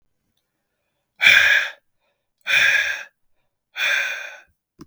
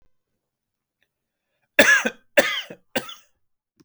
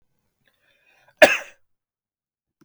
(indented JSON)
{
  "exhalation_length": "4.9 s",
  "exhalation_amplitude": 32670,
  "exhalation_signal_mean_std_ratio": 0.42,
  "three_cough_length": "3.8 s",
  "three_cough_amplitude": 32768,
  "three_cough_signal_mean_std_ratio": 0.28,
  "cough_length": "2.6 s",
  "cough_amplitude": 32766,
  "cough_signal_mean_std_ratio": 0.16,
  "survey_phase": "beta (2021-08-13 to 2022-03-07)",
  "age": "18-44",
  "gender": "Male",
  "wearing_mask": "No",
  "symptom_none": true,
  "smoker_status": "Never smoked",
  "respiratory_condition_asthma": false,
  "respiratory_condition_other": false,
  "recruitment_source": "REACT",
  "submission_delay": "1 day",
  "covid_test_result": "Negative",
  "covid_test_method": "RT-qPCR",
  "influenza_a_test_result": "Negative",
  "influenza_b_test_result": "Negative"
}